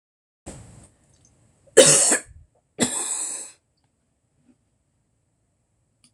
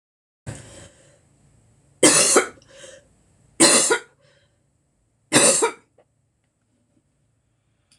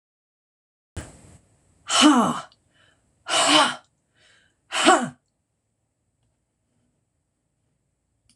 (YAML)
cough_length: 6.1 s
cough_amplitude: 26028
cough_signal_mean_std_ratio: 0.27
three_cough_length: 8.0 s
three_cough_amplitude: 26028
three_cough_signal_mean_std_ratio: 0.32
exhalation_length: 8.4 s
exhalation_amplitude: 24969
exhalation_signal_mean_std_ratio: 0.31
survey_phase: beta (2021-08-13 to 2022-03-07)
age: 65+
gender: Female
wearing_mask: 'No'
symptom_none: true
smoker_status: Never smoked
respiratory_condition_asthma: false
respiratory_condition_other: false
recruitment_source: REACT
submission_delay: 1 day
covid_test_result: Negative
covid_test_method: RT-qPCR
influenza_a_test_result: Negative
influenza_b_test_result: Negative